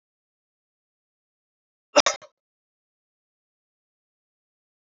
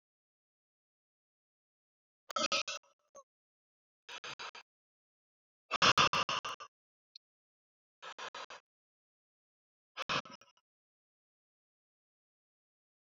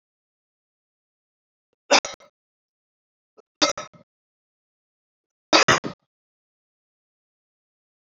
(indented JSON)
{
  "cough_length": "4.9 s",
  "cough_amplitude": 24473,
  "cough_signal_mean_std_ratio": 0.11,
  "exhalation_length": "13.1 s",
  "exhalation_amplitude": 6423,
  "exhalation_signal_mean_std_ratio": 0.22,
  "three_cough_length": "8.2 s",
  "three_cough_amplitude": 26459,
  "three_cough_signal_mean_std_ratio": 0.18,
  "survey_phase": "alpha (2021-03-01 to 2021-08-12)",
  "age": "18-44",
  "gender": "Male",
  "wearing_mask": "No",
  "symptom_none": true,
  "smoker_status": "Ex-smoker",
  "respiratory_condition_asthma": false,
  "respiratory_condition_other": false,
  "recruitment_source": "REACT",
  "submission_delay": "1 day",
  "covid_test_result": "Negative",
  "covid_test_method": "RT-qPCR"
}